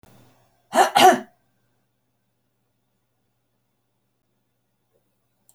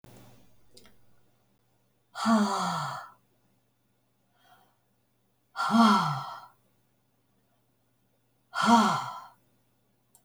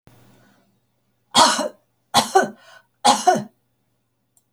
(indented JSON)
{
  "cough_length": "5.5 s",
  "cough_amplitude": 27923,
  "cough_signal_mean_std_ratio": 0.2,
  "exhalation_length": "10.2 s",
  "exhalation_amplitude": 13011,
  "exhalation_signal_mean_std_ratio": 0.35,
  "three_cough_length": "4.5 s",
  "three_cough_amplitude": 29428,
  "three_cough_signal_mean_std_ratio": 0.34,
  "survey_phase": "beta (2021-08-13 to 2022-03-07)",
  "age": "65+",
  "gender": "Female",
  "wearing_mask": "No",
  "symptom_none": true,
  "smoker_status": "Never smoked",
  "respiratory_condition_asthma": false,
  "respiratory_condition_other": false,
  "recruitment_source": "REACT",
  "submission_delay": "1 day",
  "covid_test_result": "Negative",
  "covid_test_method": "RT-qPCR"
}